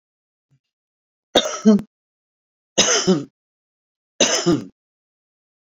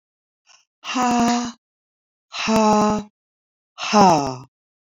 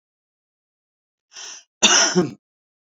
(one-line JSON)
{"three_cough_length": "5.7 s", "three_cough_amplitude": 27765, "three_cough_signal_mean_std_ratio": 0.34, "exhalation_length": "4.9 s", "exhalation_amplitude": 25897, "exhalation_signal_mean_std_ratio": 0.46, "cough_length": "3.0 s", "cough_amplitude": 32768, "cough_signal_mean_std_ratio": 0.32, "survey_phase": "beta (2021-08-13 to 2022-03-07)", "age": "45-64", "gender": "Female", "wearing_mask": "No", "symptom_none": true, "smoker_status": "Current smoker (11 or more cigarettes per day)", "respiratory_condition_asthma": false, "respiratory_condition_other": false, "recruitment_source": "REACT", "submission_delay": "2 days", "covid_test_result": "Negative", "covid_test_method": "RT-qPCR"}